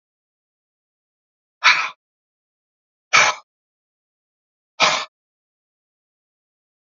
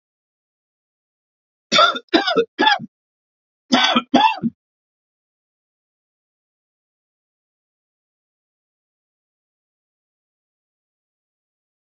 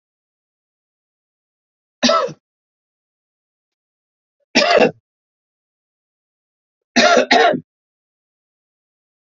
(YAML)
exhalation_length: 6.8 s
exhalation_amplitude: 32767
exhalation_signal_mean_std_ratio: 0.23
cough_length: 11.9 s
cough_amplitude: 32767
cough_signal_mean_std_ratio: 0.25
three_cough_length: 9.4 s
three_cough_amplitude: 32767
three_cough_signal_mean_std_ratio: 0.28
survey_phase: alpha (2021-03-01 to 2021-08-12)
age: 65+
gender: Male
wearing_mask: 'No'
symptom_none: true
smoker_status: Ex-smoker
respiratory_condition_asthma: false
respiratory_condition_other: false
recruitment_source: REACT
submission_delay: 2 days
covid_test_result: Negative
covid_test_method: RT-qPCR